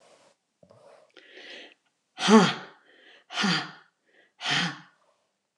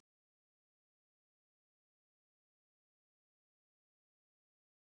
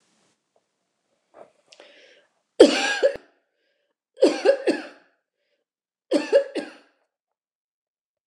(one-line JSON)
{"exhalation_length": "5.6 s", "exhalation_amplitude": 21271, "exhalation_signal_mean_std_ratio": 0.31, "cough_length": "4.9 s", "cough_amplitude": 20, "cough_signal_mean_std_ratio": 0.02, "three_cough_length": "8.3 s", "three_cough_amplitude": 29204, "three_cough_signal_mean_std_ratio": 0.28, "survey_phase": "beta (2021-08-13 to 2022-03-07)", "age": "65+", "gender": "Female", "wearing_mask": "No", "symptom_none": true, "smoker_status": "Never smoked", "respiratory_condition_asthma": false, "respiratory_condition_other": false, "recruitment_source": "REACT", "submission_delay": "2 days", "covid_test_result": "Negative", "covid_test_method": "RT-qPCR"}